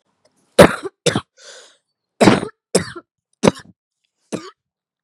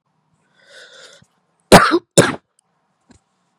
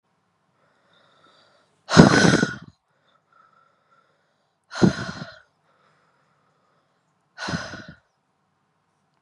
{"cough_length": "5.0 s", "cough_amplitude": 32768, "cough_signal_mean_std_ratio": 0.27, "three_cough_length": "3.6 s", "three_cough_amplitude": 32768, "three_cough_signal_mean_std_ratio": 0.25, "exhalation_length": "9.2 s", "exhalation_amplitude": 32768, "exhalation_signal_mean_std_ratio": 0.23, "survey_phase": "beta (2021-08-13 to 2022-03-07)", "age": "18-44", "gender": "Female", "wearing_mask": "Yes", "symptom_new_continuous_cough": true, "symptom_runny_or_blocked_nose": true, "symptom_sore_throat": true, "symptom_fever_high_temperature": true, "symptom_headache": true, "symptom_change_to_sense_of_smell_or_taste": true, "smoker_status": "Never smoked", "respiratory_condition_asthma": false, "respiratory_condition_other": false, "recruitment_source": "Test and Trace", "submission_delay": "2 days", "covid_test_result": "Positive", "covid_test_method": "RT-qPCR"}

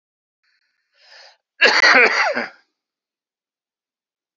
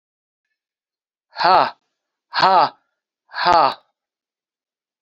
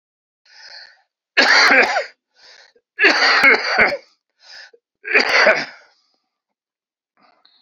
{"cough_length": "4.4 s", "cough_amplitude": 29084, "cough_signal_mean_std_ratio": 0.33, "exhalation_length": "5.0 s", "exhalation_amplitude": 30720, "exhalation_signal_mean_std_ratio": 0.32, "three_cough_length": "7.6 s", "three_cough_amplitude": 28636, "three_cough_signal_mean_std_ratio": 0.44, "survey_phase": "beta (2021-08-13 to 2022-03-07)", "age": "65+", "gender": "Male", "wearing_mask": "No", "symptom_cough_any": true, "symptom_runny_or_blocked_nose": true, "symptom_fatigue": true, "symptom_headache": true, "smoker_status": "Never smoked", "respiratory_condition_asthma": false, "respiratory_condition_other": false, "recruitment_source": "Test and Trace", "submission_delay": "2 days", "covid_test_result": "Positive", "covid_test_method": "RT-qPCR", "covid_ct_value": 18.6, "covid_ct_gene": "ORF1ab gene", "covid_ct_mean": 19.2, "covid_viral_load": "520000 copies/ml", "covid_viral_load_category": "Low viral load (10K-1M copies/ml)"}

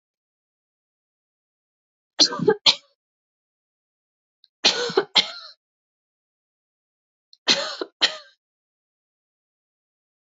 {"three_cough_length": "10.2 s", "three_cough_amplitude": 27960, "three_cough_signal_mean_std_ratio": 0.23, "survey_phase": "beta (2021-08-13 to 2022-03-07)", "age": "18-44", "gender": "Female", "wearing_mask": "No", "symptom_cough_any": true, "symptom_runny_or_blocked_nose": true, "symptom_abdominal_pain": true, "symptom_fatigue": true, "symptom_fever_high_temperature": true, "symptom_onset": "3 days", "smoker_status": "Never smoked", "respiratory_condition_asthma": true, "respiratory_condition_other": false, "recruitment_source": "Test and Trace", "submission_delay": "2 days", "covid_test_result": "Positive", "covid_test_method": "RT-qPCR", "covid_ct_value": 18.5, "covid_ct_gene": "ORF1ab gene", "covid_ct_mean": 18.7, "covid_viral_load": "710000 copies/ml", "covid_viral_load_category": "Low viral load (10K-1M copies/ml)"}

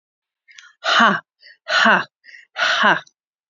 {"exhalation_length": "3.5 s", "exhalation_amplitude": 30362, "exhalation_signal_mean_std_ratio": 0.45, "survey_phase": "beta (2021-08-13 to 2022-03-07)", "age": "45-64", "gender": "Female", "wearing_mask": "No", "symptom_cough_any": true, "symptom_shortness_of_breath": true, "smoker_status": "Current smoker (11 or more cigarettes per day)", "respiratory_condition_asthma": false, "respiratory_condition_other": false, "recruitment_source": "REACT", "submission_delay": "2 days", "covid_test_result": "Negative", "covid_test_method": "RT-qPCR", "influenza_a_test_result": "Negative", "influenza_b_test_result": "Negative"}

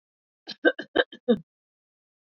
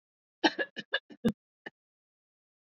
{"three_cough_length": "2.4 s", "three_cough_amplitude": 15613, "three_cough_signal_mean_std_ratio": 0.25, "cough_length": "2.6 s", "cough_amplitude": 9076, "cough_signal_mean_std_ratio": 0.24, "survey_phase": "beta (2021-08-13 to 2022-03-07)", "age": "65+", "gender": "Female", "wearing_mask": "No", "symptom_none": true, "smoker_status": "Ex-smoker", "respiratory_condition_asthma": false, "respiratory_condition_other": false, "recruitment_source": "REACT", "submission_delay": "7 days", "covid_test_result": "Negative", "covid_test_method": "RT-qPCR", "influenza_a_test_result": "Negative", "influenza_b_test_result": "Negative"}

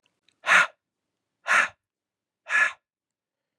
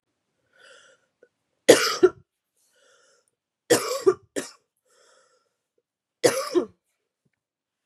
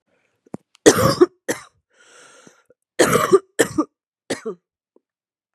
{"exhalation_length": "3.6 s", "exhalation_amplitude": 16541, "exhalation_signal_mean_std_ratio": 0.32, "three_cough_length": "7.9 s", "three_cough_amplitude": 32767, "three_cough_signal_mean_std_ratio": 0.25, "cough_length": "5.5 s", "cough_amplitude": 32768, "cough_signal_mean_std_ratio": 0.31, "survey_phase": "beta (2021-08-13 to 2022-03-07)", "age": "18-44", "gender": "Female", "wearing_mask": "No", "symptom_cough_any": true, "symptom_runny_or_blocked_nose": true, "symptom_shortness_of_breath": true, "symptom_sore_throat": true, "symptom_fatigue": true, "symptom_change_to_sense_of_smell_or_taste": true, "symptom_other": true, "symptom_onset": "3 days", "smoker_status": "Never smoked", "respiratory_condition_asthma": false, "respiratory_condition_other": false, "recruitment_source": "Test and Trace", "submission_delay": "1 day", "covid_test_result": "Positive", "covid_test_method": "RT-qPCR"}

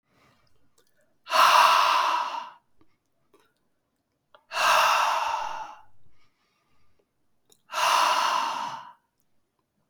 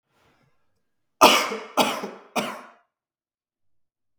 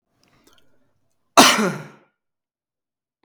{"exhalation_length": "9.9 s", "exhalation_amplitude": 17372, "exhalation_signal_mean_std_ratio": 0.46, "three_cough_length": "4.2 s", "three_cough_amplitude": 32766, "three_cough_signal_mean_std_ratio": 0.29, "cough_length": "3.2 s", "cough_amplitude": 32768, "cough_signal_mean_std_ratio": 0.24, "survey_phase": "beta (2021-08-13 to 2022-03-07)", "age": "18-44", "gender": "Male", "wearing_mask": "No", "symptom_cough_any": true, "symptom_runny_or_blocked_nose": true, "smoker_status": "Never smoked", "respiratory_condition_asthma": false, "respiratory_condition_other": false, "recruitment_source": "Test and Trace", "submission_delay": "1 day", "covid_test_result": "Positive", "covid_test_method": "RT-qPCR", "covid_ct_value": 17.5, "covid_ct_gene": "ORF1ab gene", "covid_ct_mean": 17.8, "covid_viral_load": "1500000 copies/ml", "covid_viral_load_category": "High viral load (>1M copies/ml)"}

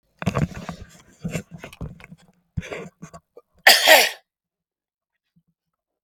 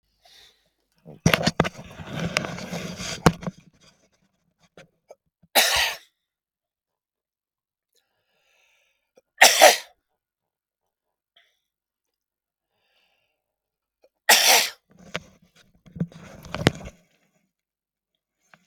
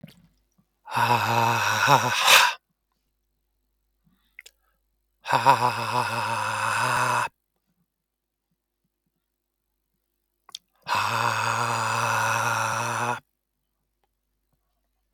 {"cough_length": "6.0 s", "cough_amplitude": 32768, "cough_signal_mean_std_ratio": 0.28, "three_cough_length": "18.7 s", "three_cough_amplitude": 32767, "three_cough_signal_mean_std_ratio": 0.24, "exhalation_length": "15.1 s", "exhalation_amplitude": 32767, "exhalation_signal_mean_std_ratio": 0.49, "survey_phase": "beta (2021-08-13 to 2022-03-07)", "age": "65+", "gender": "Male", "wearing_mask": "No", "symptom_shortness_of_breath": true, "symptom_fatigue": true, "symptom_onset": "13 days", "smoker_status": "Never smoked", "respiratory_condition_asthma": false, "respiratory_condition_other": false, "recruitment_source": "REACT", "submission_delay": "9 days", "covid_test_result": "Negative", "covid_test_method": "RT-qPCR", "influenza_a_test_result": "Negative", "influenza_b_test_result": "Negative"}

